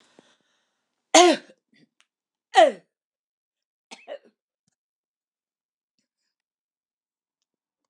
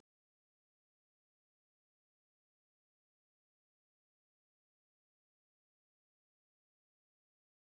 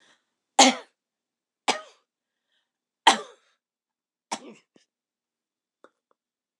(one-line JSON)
{"cough_length": "7.9 s", "cough_amplitude": 25402, "cough_signal_mean_std_ratio": 0.18, "exhalation_length": "7.6 s", "exhalation_amplitude": 33, "exhalation_signal_mean_std_ratio": 0.02, "three_cough_length": "6.6 s", "three_cough_amplitude": 25615, "three_cough_signal_mean_std_ratio": 0.17, "survey_phase": "alpha (2021-03-01 to 2021-08-12)", "age": "65+", "gender": "Female", "wearing_mask": "No", "symptom_none": true, "smoker_status": "Never smoked", "respiratory_condition_asthma": false, "respiratory_condition_other": false, "recruitment_source": "REACT", "submission_delay": "0 days", "covid_test_result": "Negative", "covid_test_method": "RT-qPCR"}